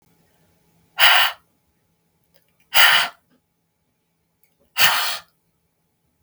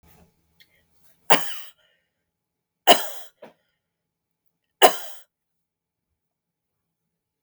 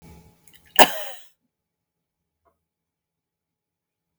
{
  "exhalation_length": "6.2 s",
  "exhalation_amplitude": 32768,
  "exhalation_signal_mean_std_ratio": 0.31,
  "three_cough_length": "7.4 s",
  "three_cough_amplitude": 32768,
  "three_cough_signal_mean_std_ratio": 0.19,
  "cough_length": "4.2 s",
  "cough_amplitude": 32768,
  "cough_signal_mean_std_ratio": 0.15,
  "survey_phase": "beta (2021-08-13 to 2022-03-07)",
  "age": "45-64",
  "gender": "Female",
  "wearing_mask": "No",
  "symptom_runny_or_blocked_nose": true,
  "symptom_shortness_of_breath": true,
  "symptom_fatigue": true,
  "symptom_headache": true,
  "smoker_status": "Never smoked",
  "respiratory_condition_asthma": false,
  "respiratory_condition_other": false,
  "recruitment_source": "Test and Trace",
  "submission_delay": "2 days",
  "covid_test_result": "Positive",
  "covid_test_method": "RT-qPCR",
  "covid_ct_value": 18.9,
  "covid_ct_gene": "ORF1ab gene",
  "covid_ct_mean": 19.3,
  "covid_viral_load": "450000 copies/ml",
  "covid_viral_load_category": "Low viral load (10K-1M copies/ml)"
}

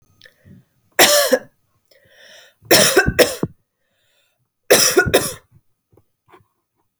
{
  "three_cough_length": "7.0 s",
  "three_cough_amplitude": 32768,
  "three_cough_signal_mean_std_ratio": 0.36,
  "survey_phase": "beta (2021-08-13 to 2022-03-07)",
  "age": "18-44",
  "gender": "Female",
  "wearing_mask": "No",
  "symptom_cough_any": true,
  "symptom_runny_or_blocked_nose": true,
  "symptom_sore_throat": true,
  "symptom_abdominal_pain": true,
  "symptom_fatigue": true,
  "symptom_headache": true,
  "symptom_change_to_sense_of_smell_or_taste": true,
  "symptom_loss_of_taste": true,
  "symptom_onset": "5 days",
  "smoker_status": "Never smoked",
  "respiratory_condition_asthma": false,
  "respiratory_condition_other": false,
  "recruitment_source": "Test and Trace",
  "submission_delay": "2 days",
  "covid_test_result": "Positive",
  "covid_test_method": "RT-qPCR",
  "covid_ct_value": 14.2,
  "covid_ct_gene": "ORF1ab gene"
}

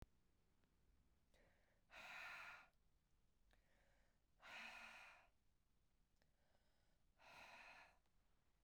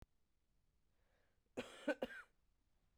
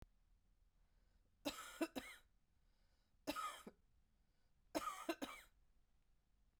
{
  "exhalation_length": "8.6 s",
  "exhalation_amplitude": 166,
  "exhalation_signal_mean_std_ratio": 0.56,
  "cough_length": "3.0 s",
  "cough_amplitude": 1652,
  "cough_signal_mean_std_ratio": 0.26,
  "three_cough_length": "6.6 s",
  "three_cough_amplitude": 1361,
  "three_cough_signal_mean_std_ratio": 0.36,
  "survey_phase": "beta (2021-08-13 to 2022-03-07)",
  "age": "45-64",
  "gender": "Female",
  "wearing_mask": "No",
  "symptom_runny_or_blocked_nose": true,
  "symptom_sore_throat": true,
  "symptom_headache": true,
  "smoker_status": "Ex-smoker",
  "respiratory_condition_asthma": false,
  "respiratory_condition_other": false,
  "recruitment_source": "Test and Trace",
  "submission_delay": "2 days",
  "covid_test_result": "Negative",
  "covid_test_method": "RT-qPCR"
}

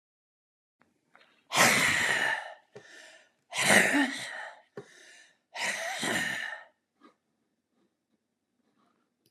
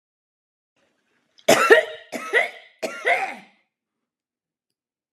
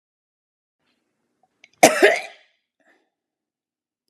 {
  "exhalation_length": "9.3 s",
  "exhalation_amplitude": 14739,
  "exhalation_signal_mean_std_ratio": 0.41,
  "three_cough_length": "5.1 s",
  "three_cough_amplitude": 32610,
  "three_cough_signal_mean_std_ratio": 0.31,
  "cough_length": "4.1 s",
  "cough_amplitude": 32768,
  "cough_signal_mean_std_ratio": 0.2,
  "survey_phase": "beta (2021-08-13 to 2022-03-07)",
  "age": "65+",
  "gender": "Female",
  "wearing_mask": "No",
  "symptom_none": true,
  "symptom_onset": "12 days",
  "smoker_status": "Never smoked",
  "respiratory_condition_asthma": false,
  "respiratory_condition_other": false,
  "recruitment_source": "REACT",
  "submission_delay": "2 days",
  "covid_test_result": "Negative",
  "covid_test_method": "RT-qPCR"
}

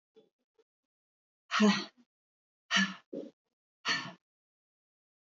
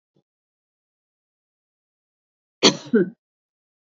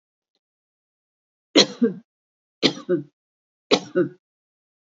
{
  "exhalation_length": "5.3 s",
  "exhalation_amplitude": 5859,
  "exhalation_signal_mean_std_ratio": 0.29,
  "cough_length": "3.9 s",
  "cough_amplitude": 27606,
  "cough_signal_mean_std_ratio": 0.19,
  "three_cough_length": "4.9 s",
  "three_cough_amplitude": 32471,
  "three_cough_signal_mean_std_ratio": 0.28,
  "survey_phase": "beta (2021-08-13 to 2022-03-07)",
  "age": "45-64",
  "gender": "Female",
  "wearing_mask": "No",
  "symptom_none": true,
  "smoker_status": "Never smoked",
  "respiratory_condition_asthma": false,
  "respiratory_condition_other": false,
  "recruitment_source": "REACT",
  "submission_delay": "2 days",
  "covid_test_result": "Negative",
  "covid_test_method": "RT-qPCR"
}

